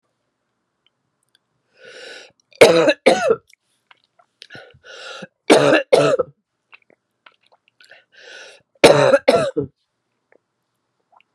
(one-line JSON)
{"three_cough_length": "11.3 s", "three_cough_amplitude": 32768, "three_cough_signal_mean_std_ratio": 0.32, "survey_phase": "beta (2021-08-13 to 2022-03-07)", "age": "45-64", "gender": "Female", "wearing_mask": "No", "symptom_cough_any": true, "symptom_runny_or_blocked_nose": true, "symptom_sore_throat": true, "symptom_fatigue": true, "symptom_fever_high_temperature": true, "symptom_headache": true, "symptom_onset": "3 days", "smoker_status": "Never smoked", "respiratory_condition_asthma": false, "respiratory_condition_other": false, "recruitment_source": "Test and Trace", "submission_delay": "1 day", "covid_test_result": "Positive", "covid_test_method": "RT-qPCR"}